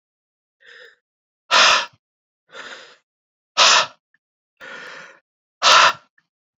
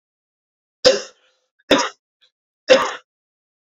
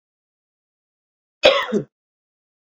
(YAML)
exhalation_length: 6.6 s
exhalation_amplitude: 31855
exhalation_signal_mean_std_ratio: 0.32
three_cough_length: 3.8 s
three_cough_amplitude: 30956
three_cough_signal_mean_std_ratio: 0.28
cough_length: 2.7 s
cough_amplitude: 32767
cough_signal_mean_std_ratio: 0.25
survey_phase: alpha (2021-03-01 to 2021-08-12)
age: 18-44
gender: Male
wearing_mask: 'No'
symptom_diarrhoea: true
symptom_fatigue: true
symptom_headache: true
symptom_change_to_sense_of_smell_or_taste: true
smoker_status: Never smoked
respiratory_condition_asthma: true
respiratory_condition_other: false
recruitment_source: Test and Trace
submission_delay: 2 days
covid_test_result: Positive
covid_test_method: RT-qPCR
covid_ct_value: 17.3
covid_ct_gene: ORF1ab gene
covid_ct_mean: 17.4
covid_viral_load: 1900000 copies/ml
covid_viral_load_category: High viral load (>1M copies/ml)